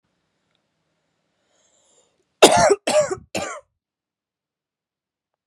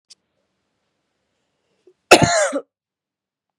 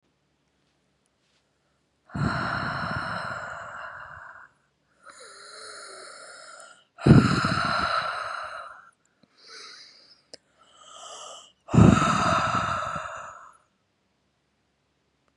{"three_cough_length": "5.5 s", "three_cough_amplitude": 32768, "three_cough_signal_mean_std_ratio": 0.26, "cough_length": "3.6 s", "cough_amplitude": 32768, "cough_signal_mean_std_ratio": 0.24, "exhalation_length": "15.4 s", "exhalation_amplitude": 26089, "exhalation_signal_mean_std_ratio": 0.38, "survey_phase": "beta (2021-08-13 to 2022-03-07)", "age": "18-44", "gender": "Female", "wearing_mask": "No", "symptom_runny_or_blocked_nose": true, "symptom_shortness_of_breath": true, "symptom_sore_throat": true, "symptom_abdominal_pain": true, "symptom_fatigue": true, "symptom_headache": true, "smoker_status": "Current smoker (1 to 10 cigarettes per day)", "respiratory_condition_asthma": true, "respiratory_condition_other": false, "recruitment_source": "Test and Trace", "submission_delay": "2 days", "covid_test_result": "Positive", "covid_test_method": "RT-qPCR", "covid_ct_value": 24.8, "covid_ct_gene": "ORF1ab gene"}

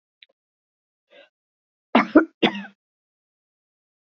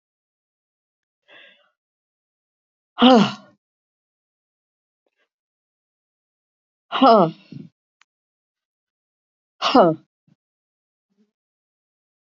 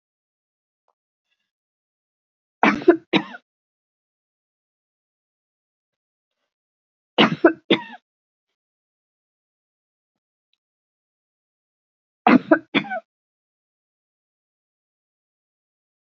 {"cough_length": "4.1 s", "cough_amplitude": 27371, "cough_signal_mean_std_ratio": 0.2, "exhalation_length": "12.4 s", "exhalation_amplitude": 31081, "exhalation_signal_mean_std_ratio": 0.21, "three_cough_length": "16.0 s", "three_cough_amplitude": 27474, "three_cough_signal_mean_std_ratio": 0.18, "survey_phase": "beta (2021-08-13 to 2022-03-07)", "age": "65+", "gender": "Female", "wearing_mask": "No", "symptom_runny_or_blocked_nose": true, "symptom_loss_of_taste": true, "symptom_onset": "4 days", "smoker_status": "Never smoked", "respiratory_condition_asthma": false, "respiratory_condition_other": true, "recruitment_source": "Test and Trace", "submission_delay": "1 day", "covid_test_result": "Negative", "covid_test_method": "RT-qPCR"}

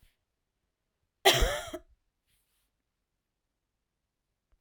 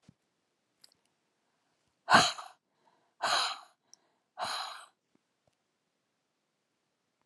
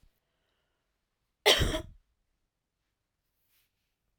{"three_cough_length": "4.6 s", "three_cough_amplitude": 14816, "three_cough_signal_mean_std_ratio": 0.21, "exhalation_length": "7.3 s", "exhalation_amplitude": 13393, "exhalation_signal_mean_std_ratio": 0.23, "cough_length": "4.2 s", "cough_amplitude": 13139, "cough_signal_mean_std_ratio": 0.21, "survey_phase": "alpha (2021-03-01 to 2021-08-12)", "age": "45-64", "gender": "Female", "wearing_mask": "No", "symptom_cough_any": true, "symptom_fatigue": true, "symptom_headache": true, "symptom_change_to_sense_of_smell_or_taste": true, "symptom_loss_of_taste": true, "symptom_onset": "5 days", "smoker_status": "Never smoked", "respiratory_condition_asthma": false, "respiratory_condition_other": false, "recruitment_source": "Test and Trace", "submission_delay": "2 days", "covid_test_result": "Positive", "covid_test_method": "RT-qPCR"}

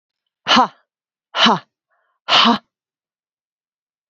{"exhalation_length": "4.1 s", "exhalation_amplitude": 31001, "exhalation_signal_mean_std_ratio": 0.33, "survey_phase": "beta (2021-08-13 to 2022-03-07)", "age": "45-64", "gender": "Female", "wearing_mask": "No", "symptom_runny_or_blocked_nose": true, "smoker_status": "Ex-smoker", "respiratory_condition_asthma": false, "respiratory_condition_other": false, "recruitment_source": "REACT", "submission_delay": "0 days", "covid_test_result": "Negative", "covid_test_method": "RT-qPCR", "influenza_a_test_result": "Negative", "influenza_b_test_result": "Negative"}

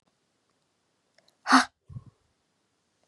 {"exhalation_length": "3.1 s", "exhalation_amplitude": 22930, "exhalation_signal_mean_std_ratio": 0.18, "survey_phase": "beta (2021-08-13 to 2022-03-07)", "age": "18-44", "gender": "Female", "wearing_mask": "No", "symptom_runny_or_blocked_nose": true, "symptom_fatigue": true, "symptom_onset": "3 days", "smoker_status": "Never smoked", "respiratory_condition_asthma": false, "respiratory_condition_other": false, "recruitment_source": "Test and Trace", "submission_delay": "2 days", "covid_test_result": "Positive", "covid_test_method": "RT-qPCR", "covid_ct_value": 19.5, "covid_ct_gene": "N gene", "covid_ct_mean": 19.8, "covid_viral_load": "320000 copies/ml", "covid_viral_load_category": "Low viral load (10K-1M copies/ml)"}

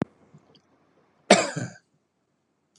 {"cough_length": "2.8 s", "cough_amplitude": 30472, "cough_signal_mean_std_ratio": 0.21, "survey_phase": "beta (2021-08-13 to 2022-03-07)", "age": "45-64", "gender": "Male", "wearing_mask": "No", "symptom_none": true, "smoker_status": "Never smoked", "respiratory_condition_asthma": false, "respiratory_condition_other": false, "recruitment_source": "REACT", "submission_delay": "1 day", "covid_test_result": "Negative", "covid_test_method": "RT-qPCR"}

